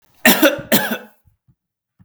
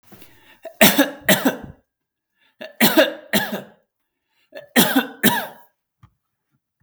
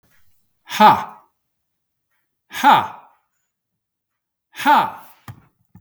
{
  "cough_length": "2.0 s",
  "cough_amplitude": 32768,
  "cough_signal_mean_std_ratio": 0.4,
  "three_cough_length": "6.8 s",
  "three_cough_amplitude": 32768,
  "three_cough_signal_mean_std_ratio": 0.37,
  "exhalation_length": "5.8 s",
  "exhalation_amplitude": 32248,
  "exhalation_signal_mean_std_ratio": 0.3,
  "survey_phase": "beta (2021-08-13 to 2022-03-07)",
  "age": "45-64",
  "gender": "Male",
  "wearing_mask": "No",
  "symptom_none": true,
  "smoker_status": "Never smoked",
  "respiratory_condition_asthma": false,
  "respiratory_condition_other": false,
  "recruitment_source": "REACT",
  "submission_delay": "2 days",
  "covid_test_result": "Negative",
  "covid_test_method": "RT-qPCR",
  "influenza_a_test_result": "Negative",
  "influenza_b_test_result": "Negative"
}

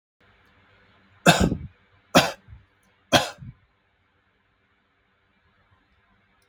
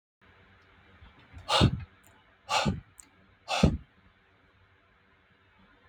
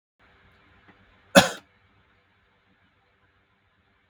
{
  "three_cough_length": "6.5 s",
  "three_cough_amplitude": 32766,
  "three_cough_signal_mean_std_ratio": 0.23,
  "exhalation_length": "5.9 s",
  "exhalation_amplitude": 12613,
  "exhalation_signal_mean_std_ratio": 0.31,
  "cough_length": "4.1 s",
  "cough_amplitude": 32768,
  "cough_signal_mean_std_ratio": 0.14,
  "survey_phase": "beta (2021-08-13 to 2022-03-07)",
  "age": "18-44",
  "gender": "Male",
  "wearing_mask": "No",
  "symptom_none": true,
  "smoker_status": "Never smoked",
  "respiratory_condition_asthma": false,
  "respiratory_condition_other": false,
  "recruitment_source": "REACT",
  "submission_delay": "3 days",
  "covid_test_result": "Negative",
  "covid_test_method": "RT-qPCR",
  "influenza_a_test_result": "Negative",
  "influenza_b_test_result": "Negative"
}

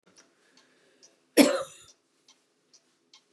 {
  "cough_length": "3.3 s",
  "cough_amplitude": 24577,
  "cough_signal_mean_std_ratio": 0.2,
  "survey_phase": "beta (2021-08-13 to 2022-03-07)",
  "age": "65+",
  "gender": "Female",
  "wearing_mask": "No",
  "symptom_shortness_of_breath": true,
  "smoker_status": "Never smoked",
  "respiratory_condition_asthma": true,
  "respiratory_condition_other": false,
  "recruitment_source": "REACT",
  "submission_delay": "1 day",
  "covid_test_result": "Negative",
  "covid_test_method": "RT-qPCR",
  "influenza_a_test_result": "Negative",
  "influenza_b_test_result": "Negative"
}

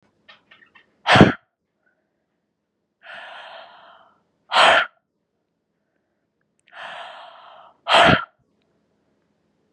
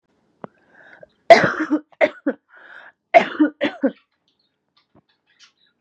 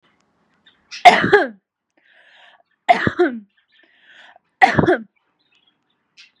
{
  "exhalation_length": "9.7 s",
  "exhalation_amplitude": 32768,
  "exhalation_signal_mean_std_ratio": 0.26,
  "cough_length": "5.8 s",
  "cough_amplitude": 32768,
  "cough_signal_mean_std_ratio": 0.28,
  "three_cough_length": "6.4 s",
  "three_cough_amplitude": 32768,
  "three_cough_signal_mean_std_ratio": 0.3,
  "survey_phase": "beta (2021-08-13 to 2022-03-07)",
  "age": "18-44",
  "gender": "Female",
  "wearing_mask": "No",
  "symptom_none": true,
  "symptom_onset": "12 days",
  "smoker_status": "Current smoker (e-cigarettes or vapes only)",
  "respiratory_condition_asthma": false,
  "respiratory_condition_other": false,
  "recruitment_source": "REACT",
  "submission_delay": "3 days",
  "covid_test_result": "Negative",
  "covid_test_method": "RT-qPCR",
  "influenza_a_test_result": "Negative",
  "influenza_b_test_result": "Negative"
}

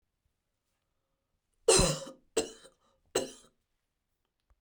{
  "three_cough_length": "4.6 s",
  "three_cough_amplitude": 9399,
  "three_cough_signal_mean_std_ratio": 0.25,
  "survey_phase": "beta (2021-08-13 to 2022-03-07)",
  "age": "45-64",
  "gender": "Female",
  "wearing_mask": "No",
  "symptom_cough_any": true,
  "symptom_runny_or_blocked_nose": true,
  "symptom_shortness_of_breath": true,
  "symptom_sore_throat": true,
  "symptom_abdominal_pain": true,
  "symptom_fatigue": true,
  "symptom_headache": true,
  "smoker_status": "Ex-smoker",
  "respiratory_condition_asthma": false,
  "respiratory_condition_other": false,
  "recruitment_source": "REACT",
  "submission_delay": "2 days",
  "covid_test_result": "Negative",
  "covid_test_method": "RT-qPCR"
}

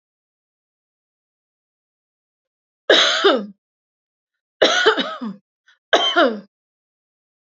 {
  "three_cough_length": "7.5 s",
  "three_cough_amplitude": 28774,
  "three_cough_signal_mean_std_ratio": 0.34,
  "survey_phase": "beta (2021-08-13 to 2022-03-07)",
  "age": "45-64",
  "gender": "Female",
  "wearing_mask": "No",
  "symptom_none": true,
  "smoker_status": "Never smoked",
  "respiratory_condition_asthma": false,
  "respiratory_condition_other": false,
  "recruitment_source": "REACT",
  "submission_delay": "2 days",
  "covid_test_result": "Negative",
  "covid_test_method": "RT-qPCR",
  "influenza_a_test_result": "Unknown/Void",
  "influenza_b_test_result": "Unknown/Void"
}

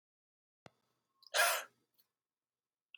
{
  "exhalation_length": "3.0 s",
  "exhalation_amplitude": 3862,
  "exhalation_signal_mean_std_ratio": 0.24,
  "survey_phase": "alpha (2021-03-01 to 2021-08-12)",
  "age": "18-44",
  "gender": "Male",
  "wearing_mask": "No",
  "symptom_cough_any": true,
  "symptom_fatigue": true,
  "symptom_fever_high_temperature": true,
  "symptom_change_to_sense_of_smell_or_taste": true,
  "symptom_onset": "4 days",
  "smoker_status": "Never smoked",
  "respiratory_condition_asthma": true,
  "respiratory_condition_other": false,
  "recruitment_source": "Test and Trace",
  "submission_delay": "1 day",
  "covid_test_result": "Positive",
  "covid_test_method": "RT-qPCR",
  "covid_ct_value": 17.8,
  "covid_ct_gene": "ORF1ab gene",
  "covid_ct_mean": 18.6,
  "covid_viral_load": "810000 copies/ml",
  "covid_viral_load_category": "Low viral load (10K-1M copies/ml)"
}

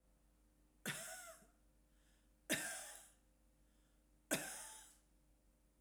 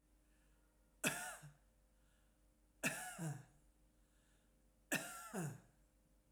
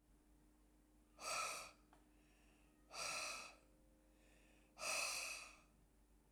{
  "three_cough_length": "5.8 s",
  "three_cough_amplitude": 2354,
  "three_cough_signal_mean_std_ratio": 0.39,
  "cough_length": "6.3 s",
  "cough_amplitude": 2115,
  "cough_signal_mean_std_ratio": 0.4,
  "exhalation_length": "6.3 s",
  "exhalation_amplitude": 1057,
  "exhalation_signal_mean_std_ratio": 0.5,
  "survey_phase": "alpha (2021-03-01 to 2021-08-12)",
  "age": "65+",
  "gender": "Female",
  "wearing_mask": "No",
  "symptom_none": true,
  "smoker_status": "Ex-smoker",
  "respiratory_condition_asthma": true,
  "respiratory_condition_other": false,
  "recruitment_source": "REACT",
  "submission_delay": "1 day",
  "covid_test_result": "Negative",
  "covid_test_method": "RT-qPCR"
}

